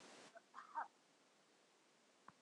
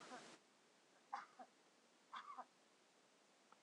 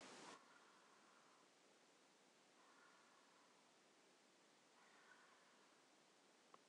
{"cough_length": "2.4 s", "cough_amplitude": 672, "cough_signal_mean_std_ratio": 0.4, "three_cough_length": "3.6 s", "three_cough_amplitude": 650, "three_cough_signal_mean_std_ratio": 0.51, "exhalation_length": "6.7 s", "exhalation_amplitude": 133, "exhalation_signal_mean_std_ratio": 0.89, "survey_phase": "beta (2021-08-13 to 2022-03-07)", "age": "65+", "gender": "Female", "wearing_mask": "No", "symptom_none": true, "smoker_status": "Ex-smoker", "respiratory_condition_asthma": false, "respiratory_condition_other": false, "recruitment_source": "REACT", "submission_delay": "2 days", "covid_test_result": "Negative", "covid_test_method": "RT-qPCR", "influenza_a_test_result": "Negative", "influenza_b_test_result": "Negative"}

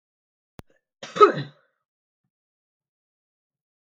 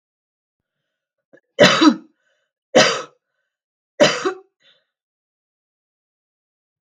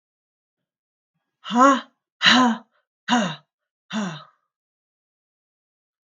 {"cough_length": "3.9 s", "cough_amplitude": 29878, "cough_signal_mean_std_ratio": 0.16, "three_cough_length": "6.9 s", "three_cough_amplitude": 32768, "three_cough_signal_mean_std_ratio": 0.26, "exhalation_length": "6.1 s", "exhalation_amplitude": 30541, "exhalation_signal_mean_std_ratio": 0.32, "survey_phase": "beta (2021-08-13 to 2022-03-07)", "age": "45-64", "gender": "Female", "wearing_mask": "No", "symptom_runny_or_blocked_nose": true, "symptom_onset": "4 days", "smoker_status": "Never smoked", "respiratory_condition_asthma": false, "respiratory_condition_other": false, "recruitment_source": "REACT", "submission_delay": "3 days", "covid_test_result": "Negative", "covid_test_method": "RT-qPCR", "influenza_a_test_result": "Unknown/Void", "influenza_b_test_result": "Unknown/Void"}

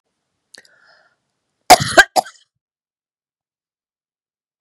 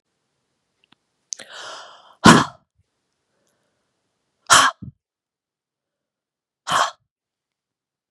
{"cough_length": "4.6 s", "cough_amplitude": 32768, "cough_signal_mean_std_ratio": 0.18, "exhalation_length": "8.1 s", "exhalation_amplitude": 32768, "exhalation_signal_mean_std_ratio": 0.21, "survey_phase": "beta (2021-08-13 to 2022-03-07)", "age": "45-64", "gender": "Female", "wearing_mask": "No", "symptom_none": true, "symptom_onset": "4 days", "smoker_status": "Prefer not to say", "respiratory_condition_asthma": false, "respiratory_condition_other": false, "recruitment_source": "REACT", "submission_delay": "1 day", "covid_test_result": "Negative", "covid_test_method": "RT-qPCR", "influenza_a_test_result": "Negative", "influenza_b_test_result": "Negative"}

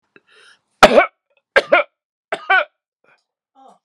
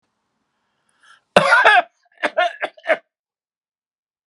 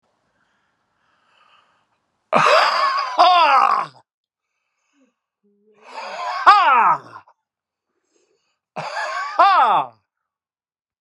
{"three_cough_length": "3.8 s", "three_cough_amplitude": 32768, "three_cough_signal_mean_std_ratio": 0.29, "cough_length": "4.3 s", "cough_amplitude": 32768, "cough_signal_mean_std_ratio": 0.33, "exhalation_length": "11.0 s", "exhalation_amplitude": 32768, "exhalation_signal_mean_std_ratio": 0.42, "survey_phase": "alpha (2021-03-01 to 2021-08-12)", "age": "65+", "gender": "Male", "wearing_mask": "No", "symptom_fatigue": true, "smoker_status": "Never smoked", "respiratory_condition_asthma": false, "respiratory_condition_other": false, "recruitment_source": "REACT", "submission_delay": "2 days", "covid_test_result": "Negative", "covid_test_method": "RT-qPCR"}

